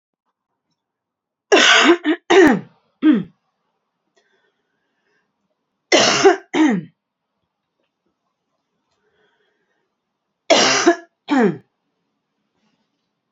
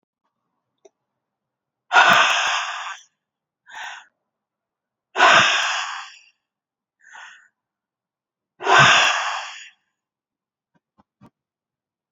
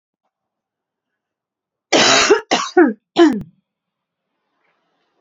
{"three_cough_length": "13.3 s", "three_cough_amplitude": 31816, "three_cough_signal_mean_std_ratio": 0.35, "exhalation_length": "12.1 s", "exhalation_amplitude": 27974, "exhalation_signal_mean_std_ratio": 0.34, "cough_length": "5.2 s", "cough_amplitude": 31287, "cough_signal_mean_std_ratio": 0.35, "survey_phase": "beta (2021-08-13 to 2022-03-07)", "age": "45-64", "gender": "Female", "wearing_mask": "No", "symptom_cough_any": true, "symptom_runny_or_blocked_nose": true, "symptom_sore_throat": true, "symptom_headache": true, "symptom_change_to_sense_of_smell_or_taste": true, "symptom_loss_of_taste": true, "symptom_onset": "4 days", "smoker_status": "Ex-smoker", "respiratory_condition_asthma": false, "respiratory_condition_other": false, "recruitment_source": "Test and Trace", "submission_delay": "2 days", "covid_test_result": "Positive", "covid_test_method": "RT-qPCR", "covid_ct_value": 12.8, "covid_ct_gene": "ORF1ab gene", "covid_ct_mean": 13.5, "covid_viral_load": "36000000 copies/ml", "covid_viral_load_category": "High viral load (>1M copies/ml)"}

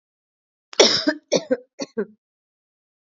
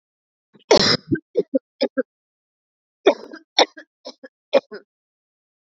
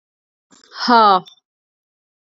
{"cough_length": "3.2 s", "cough_amplitude": 30499, "cough_signal_mean_std_ratio": 0.31, "three_cough_length": "5.7 s", "three_cough_amplitude": 32373, "three_cough_signal_mean_std_ratio": 0.28, "exhalation_length": "2.4 s", "exhalation_amplitude": 29162, "exhalation_signal_mean_std_ratio": 0.32, "survey_phase": "beta (2021-08-13 to 2022-03-07)", "age": "18-44", "gender": "Female", "wearing_mask": "No", "symptom_none": true, "smoker_status": "Never smoked", "respiratory_condition_asthma": false, "respiratory_condition_other": false, "recruitment_source": "REACT", "submission_delay": "0 days", "covid_test_result": "Negative", "covid_test_method": "RT-qPCR"}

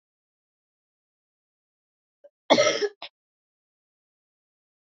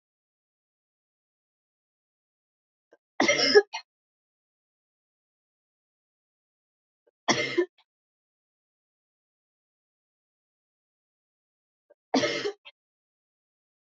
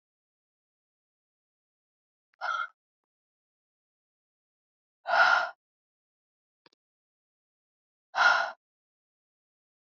{"cough_length": "4.9 s", "cough_amplitude": 20076, "cough_signal_mean_std_ratio": 0.2, "three_cough_length": "14.0 s", "three_cough_amplitude": 17899, "three_cough_signal_mean_std_ratio": 0.2, "exhalation_length": "9.8 s", "exhalation_amplitude": 10210, "exhalation_signal_mean_std_ratio": 0.23, "survey_phase": "beta (2021-08-13 to 2022-03-07)", "age": "18-44", "gender": "Female", "wearing_mask": "No", "symptom_cough_any": true, "symptom_new_continuous_cough": true, "symptom_runny_or_blocked_nose": true, "symptom_shortness_of_breath": true, "symptom_sore_throat": true, "symptom_fatigue": true, "symptom_fever_high_temperature": true, "symptom_headache": true, "smoker_status": "Never smoked", "respiratory_condition_asthma": true, "respiratory_condition_other": false, "recruitment_source": "Test and Trace", "submission_delay": "1 day", "covid_test_result": "Positive", "covid_test_method": "LFT"}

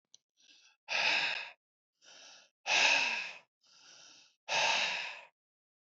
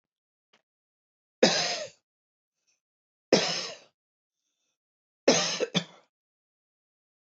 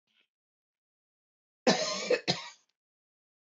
{"exhalation_length": "6.0 s", "exhalation_amplitude": 6964, "exhalation_signal_mean_std_ratio": 0.46, "three_cough_length": "7.3 s", "three_cough_amplitude": 16968, "three_cough_signal_mean_std_ratio": 0.28, "cough_length": "3.5 s", "cough_amplitude": 10497, "cough_signal_mean_std_ratio": 0.3, "survey_phase": "alpha (2021-03-01 to 2021-08-12)", "age": "45-64", "gender": "Male", "wearing_mask": "No", "symptom_none": true, "smoker_status": "Ex-smoker", "respiratory_condition_asthma": false, "respiratory_condition_other": false, "recruitment_source": "REACT", "submission_delay": "2 days", "covid_test_result": "Negative", "covid_test_method": "RT-qPCR"}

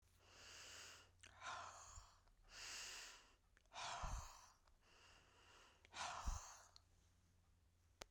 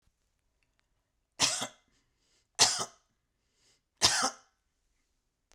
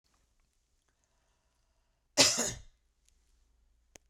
{"exhalation_length": "8.1 s", "exhalation_amplitude": 736, "exhalation_signal_mean_std_ratio": 0.57, "three_cough_length": "5.5 s", "three_cough_amplitude": 17612, "three_cough_signal_mean_std_ratio": 0.27, "cough_length": "4.1 s", "cough_amplitude": 12045, "cough_signal_mean_std_ratio": 0.21, "survey_phase": "beta (2021-08-13 to 2022-03-07)", "age": "65+", "gender": "Female", "wearing_mask": "No", "symptom_none": true, "smoker_status": "Never smoked", "respiratory_condition_asthma": false, "respiratory_condition_other": false, "recruitment_source": "REACT", "submission_delay": "2 days", "covid_test_result": "Negative", "covid_test_method": "RT-qPCR"}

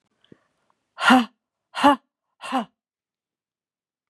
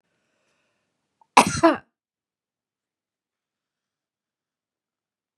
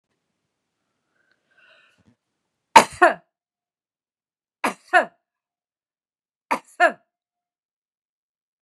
{"exhalation_length": "4.1 s", "exhalation_amplitude": 28633, "exhalation_signal_mean_std_ratio": 0.27, "cough_length": "5.4 s", "cough_amplitude": 32768, "cough_signal_mean_std_ratio": 0.16, "three_cough_length": "8.6 s", "three_cough_amplitude": 32768, "three_cough_signal_mean_std_ratio": 0.17, "survey_phase": "beta (2021-08-13 to 2022-03-07)", "age": "65+", "gender": "Female", "wearing_mask": "No", "symptom_none": true, "smoker_status": "Ex-smoker", "respiratory_condition_asthma": false, "respiratory_condition_other": false, "recruitment_source": "REACT", "submission_delay": "0 days", "covid_test_result": "Negative", "covid_test_method": "RT-qPCR", "influenza_a_test_result": "Negative", "influenza_b_test_result": "Negative"}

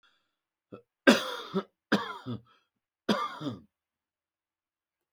{"three_cough_length": "5.1 s", "three_cough_amplitude": 22752, "three_cough_signal_mean_std_ratio": 0.29, "survey_phase": "beta (2021-08-13 to 2022-03-07)", "age": "65+", "gender": "Male", "wearing_mask": "No", "symptom_none": true, "smoker_status": "Ex-smoker", "respiratory_condition_asthma": false, "respiratory_condition_other": false, "recruitment_source": "REACT", "submission_delay": "2 days", "covid_test_result": "Negative", "covid_test_method": "RT-qPCR"}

